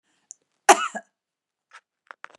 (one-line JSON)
{"cough_length": "2.4 s", "cough_amplitude": 32764, "cough_signal_mean_std_ratio": 0.17, "survey_phase": "beta (2021-08-13 to 2022-03-07)", "age": "45-64", "gender": "Female", "wearing_mask": "No", "symptom_cough_any": true, "symptom_new_continuous_cough": true, "symptom_shortness_of_breath": true, "symptom_fatigue": true, "symptom_headache": true, "symptom_onset": "5 days", "smoker_status": "Never smoked", "respiratory_condition_asthma": false, "respiratory_condition_other": false, "recruitment_source": "Test and Trace", "submission_delay": "1 day", "covid_test_result": "Negative", "covid_test_method": "RT-qPCR"}